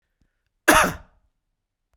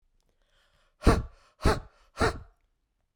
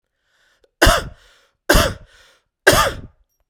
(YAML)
cough_length: 2.0 s
cough_amplitude: 32767
cough_signal_mean_std_ratio: 0.27
exhalation_length: 3.2 s
exhalation_amplitude: 14409
exhalation_signal_mean_std_ratio: 0.3
three_cough_length: 3.5 s
three_cough_amplitude: 32768
three_cough_signal_mean_std_ratio: 0.36
survey_phase: beta (2021-08-13 to 2022-03-07)
age: 45-64
gender: Male
wearing_mask: 'No'
symptom_none: true
smoker_status: Ex-smoker
respiratory_condition_asthma: false
respiratory_condition_other: false
recruitment_source: REACT
submission_delay: 1 day
covid_test_result: Negative
covid_test_method: RT-qPCR
influenza_a_test_result: Negative
influenza_b_test_result: Negative